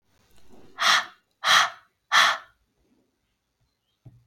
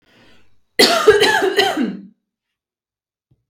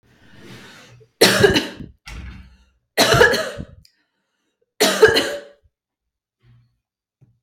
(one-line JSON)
{"exhalation_length": "4.3 s", "exhalation_amplitude": 21873, "exhalation_signal_mean_std_ratio": 0.34, "cough_length": "3.5 s", "cough_amplitude": 32768, "cough_signal_mean_std_ratio": 0.45, "three_cough_length": "7.4 s", "three_cough_amplitude": 32768, "three_cough_signal_mean_std_ratio": 0.36, "survey_phase": "beta (2021-08-13 to 2022-03-07)", "age": "18-44", "gender": "Female", "wearing_mask": "No", "symptom_runny_or_blocked_nose": true, "symptom_sore_throat": true, "symptom_fatigue": true, "symptom_headache": true, "smoker_status": "Never smoked", "respiratory_condition_asthma": false, "respiratory_condition_other": false, "recruitment_source": "Test and Trace", "submission_delay": "2 days", "covid_test_result": "Positive", "covid_test_method": "ePCR"}